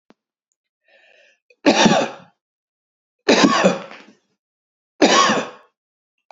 {"three_cough_length": "6.3 s", "three_cough_amplitude": 28339, "three_cough_signal_mean_std_ratio": 0.37, "survey_phase": "beta (2021-08-13 to 2022-03-07)", "age": "45-64", "gender": "Male", "wearing_mask": "No", "symptom_none": true, "smoker_status": "Never smoked", "respiratory_condition_asthma": false, "respiratory_condition_other": false, "recruitment_source": "REACT", "submission_delay": "1 day", "covid_test_result": "Negative", "covid_test_method": "RT-qPCR", "influenza_a_test_result": "Negative", "influenza_b_test_result": "Negative"}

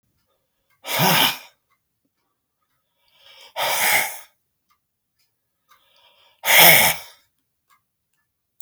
{"exhalation_length": "8.6 s", "exhalation_amplitude": 32768, "exhalation_signal_mean_std_ratio": 0.31, "survey_phase": "alpha (2021-03-01 to 2021-08-12)", "age": "65+", "gender": "Male", "wearing_mask": "No", "symptom_none": true, "smoker_status": "Never smoked", "respiratory_condition_asthma": false, "respiratory_condition_other": false, "recruitment_source": "REACT", "submission_delay": "3 days", "covid_test_result": "Negative", "covid_test_method": "RT-qPCR"}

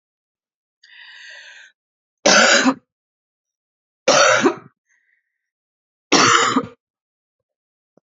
{"three_cough_length": "8.0 s", "three_cough_amplitude": 30545, "three_cough_signal_mean_std_ratio": 0.35, "survey_phase": "beta (2021-08-13 to 2022-03-07)", "age": "45-64", "gender": "Female", "wearing_mask": "No", "symptom_new_continuous_cough": true, "symptom_runny_or_blocked_nose": true, "symptom_sore_throat": true, "symptom_other": true, "smoker_status": "Never smoked", "respiratory_condition_asthma": false, "respiratory_condition_other": false, "recruitment_source": "Test and Trace", "submission_delay": "3 days", "covid_test_result": "Positive", "covid_test_method": "ePCR"}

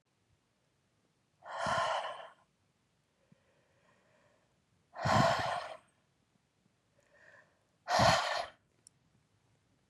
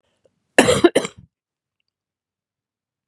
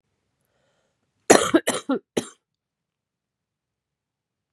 {"exhalation_length": "9.9 s", "exhalation_amplitude": 6861, "exhalation_signal_mean_std_ratio": 0.34, "cough_length": "3.1 s", "cough_amplitude": 32768, "cough_signal_mean_std_ratio": 0.24, "three_cough_length": "4.5 s", "three_cough_amplitude": 32767, "three_cough_signal_mean_std_ratio": 0.22, "survey_phase": "beta (2021-08-13 to 2022-03-07)", "age": "45-64", "gender": "Female", "wearing_mask": "No", "symptom_runny_or_blocked_nose": true, "symptom_fatigue": true, "symptom_headache": true, "symptom_loss_of_taste": true, "symptom_onset": "3 days", "smoker_status": "Current smoker (e-cigarettes or vapes only)", "respiratory_condition_asthma": false, "respiratory_condition_other": false, "recruitment_source": "Test and Trace", "submission_delay": "2 days", "covid_test_result": "Positive", "covid_test_method": "RT-qPCR", "covid_ct_value": 24.2, "covid_ct_gene": "ORF1ab gene"}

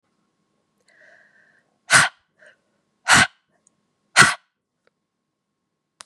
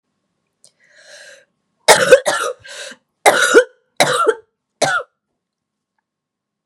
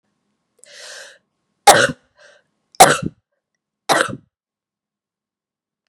{"exhalation_length": "6.1 s", "exhalation_amplitude": 32768, "exhalation_signal_mean_std_ratio": 0.23, "cough_length": "6.7 s", "cough_amplitude": 32768, "cough_signal_mean_std_ratio": 0.35, "three_cough_length": "5.9 s", "three_cough_amplitude": 32768, "three_cough_signal_mean_std_ratio": 0.24, "survey_phase": "beta (2021-08-13 to 2022-03-07)", "age": "18-44", "gender": "Female", "wearing_mask": "No", "symptom_cough_any": true, "symptom_new_continuous_cough": true, "symptom_runny_or_blocked_nose": true, "symptom_headache": true, "symptom_onset": "3 days", "smoker_status": "Never smoked", "respiratory_condition_asthma": false, "respiratory_condition_other": false, "recruitment_source": "Test and Trace", "submission_delay": "1 day", "covid_test_result": "Negative", "covid_test_method": "RT-qPCR"}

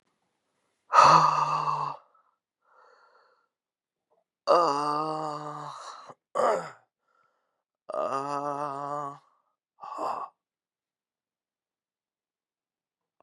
{"exhalation_length": "13.2 s", "exhalation_amplitude": 20383, "exhalation_signal_mean_std_ratio": 0.35, "survey_phase": "beta (2021-08-13 to 2022-03-07)", "age": "18-44", "gender": "Male", "wearing_mask": "No", "symptom_cough_any": true, "symptom_runny_or_blocked_nose": true, "symptom_sore_throat": true, "symptom_headache": true, "symptom_other": true, "symptom_onset": "2 days", "smoker_status": "Ex-smoker", "respiratory_condition_asthma": false, "respiratory_condition_other": false, "recruitment_source": "Test and Trace", "submission_delay": "1 day", "covid_test_result": "Positive", "covid_test_method": "RT-qPCR", "covid_ct_value": 17.8, "covid_ct_gene": "N gene"}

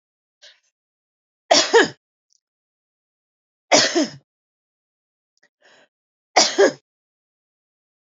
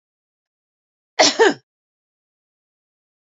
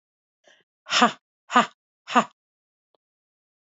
{"three_cough_length": "8.0 s", "three_cough_amplitude": 29303, "three_cough_signal_mean_std_ratio": 0.26, "cough_length": "3.3 s", "cough_amplitude": 28894, "cough_signal_mean_std_ratio": 0.22, "exhalation_length": "3.7 s", "exhalation_amplitude": 24386, "exhalation_signal_mean_std_ratio": 0.24, "survey_phase": "beta (2021-08-13 to 2022-03-07)", "age": "45-64", "gender": "Female", "wearing_mask": "No", "symptom_none": true, "smoker_status": "Never smoked", "respiratory_condition_asthma": false, "respiratory_condition_other": false, "recruitment_source": "REACT", "submission_delay": "1 day", "covid_test_result": "Negative", "covid_test_method": "RT-qPCR", "influenza_a_test_result": "Negative", "influenza_b_test_result": "Negative"}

